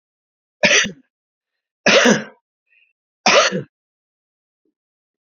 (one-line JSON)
{"three_cough_length": "5.3 s", "three_cough_amplitude": 31305, "three_cough_signal_mean_std_ratio": 0.33, "survey_phase": "beta (2021-08-13 to 2022-03-07)", "age": "65+", "gender": "Male", "wearing_mask": "No", "symptom_cough_any": true, "symptom_runny_or_blocked_nose": true, "symptom_onset": "12 days", "smoker_status": "Never smoked", "respiratory_condition_asthma": false, "respiratory_condition_other": false, "recruitment_source": "REACT", "submission_delay": "1 day", "covid_test_result": "Negative", "covid_test_method": "RT-qPCR"}